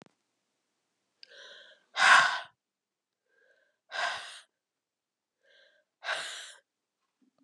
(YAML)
exhalation_length: 7.4 s
exhalation_amplitude: 14409
exhalation_signal_mean_std_ratio: 0.24
survey_phase: beta (2021-08-13 to 2022-03-07)
age: 45-64
gender: Female
wearing_mask: 'No'
symptom_cough_any: true
symptom_new_continuous_cough: true
symptom_runny_or_blocked_nose: true
symptom_shortness_of_breath: true
symptom_onset: 3 days
smoker_status: Ex-smoker
respiratory_condition_asthma: false
respiratory_condition_other: false
recruitment_source: Test and Trace
submission_delay: 1 day
covid_test_result: Positive
covid_test_method: RT-qPCR
covid_ct_value: 25.7
covid_ct_gene: N gene